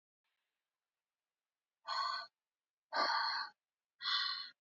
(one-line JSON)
{"exhalation_length": "4.6 s", "exhalation_amplitude": 2527, "exhalation_signal_mean_std_ratio": 0.45, "survey_phase": "alpha (2021-03-01 to 2021-08-12)", "age": "18-44", "gender": "Female", "wearing_mask": "No", "symptom_none": true, "symptom_onset": "12 days", "smoker_status": "Never smoked", "respiratory_condition_asthma": false, "respiratory_condition_other": false, "recruitment_source": "REACT", "submission_delay": "9 days", "covid_test_result": "Negative", "covid_test_method": "RT-qPCR"}